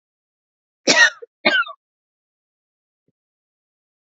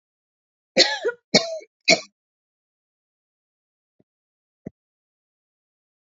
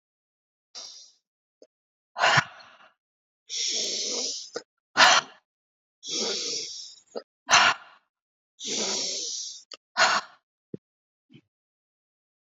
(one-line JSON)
{"cough_length": "4.1 s", "cough_amplitude": 30320, "cough_signal_mean_std_ratio": 0.25, "three_cough_length": "6.1 s", "three_cough_amplitude": 30400, "three_cough_signal_mean_std_ratio": 0.21, "exhalation_length": "12.5 s", "exhalation_amplitude": 22601, "exhalation_signal_mean_std_ratio": 0.37, "survey_phase": "beta (2021-08-13 to 2022-03-07)", "age": "45-64", "gender": "Female", "wearing_mask": "Yes", "symptom_cough_any": true, "symptom_runny_or_blocked_nose": true, "symptom_abdominal_pain": true, "symptom_onset": "5 days", "smoker_status": "Never smoked", "respiratory_condition_asthma": false, "respiratory_condition_other": false, "recruitment_source": "Test and Trace", "submission_delay": "2 days", "covid_test_result": "Positive", "covid_test_method": "RT-qPCR", "covid_ct_value": 17.8, "covid_ct_gene": "ORF1ab gene"}